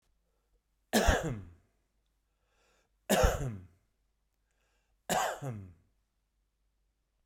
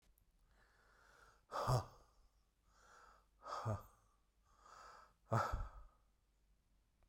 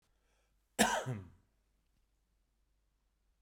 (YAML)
three_cough_length: 7.3 s
three_cough_amplitude: 9794
three_cough_signal_mean_std_ratio: 0.32
exhalation_length: 7.1 s
exhalation_amplitude: 2049
exhalation_signal_mean_std_ratio: 0.34
cough_length: 3.4 s
cough_amplitude: 7908
cough_signal_mean_std_ratio: 0.25
survey_phase: beta (2021-08-13 to 2022-03-07)
age: 65+
gender: Male
wearing_mask: 'No'
symptom_none: true
smoker_status: Never smoked
respiratory_condition_asthma: false
respiratory_condition_other: false
recruitment_source: REACT
submission_delay: 3 days
covid_test_result: Negative
covid_test_method: RT-qPCR
influenza_a_test_result: Negative
influenza_b_test_result: Negative